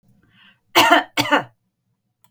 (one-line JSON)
{"cough_length": "2.3 s", "cough_amplitude": 32768, "cough_signal_mean_std_ratio": 0.36, "survey_phase": "beta (2021-08-13 to 2022-03-07)", "age": "65+", "gender": "Female", "wearing_mask": "No", "symptom_none": true, "smoker_status": "Never smoked", "respiratory_condition_asthma": false, "respiratory_condition_other": false, "recruitment_source": "REACT", "submission_delay": "1 day", "covid_test_result": "Negative", "covid_test_method": "RT-qPCR", "influenza_a_test_result": "Negative", "influenza_b_test_result": "Negative"}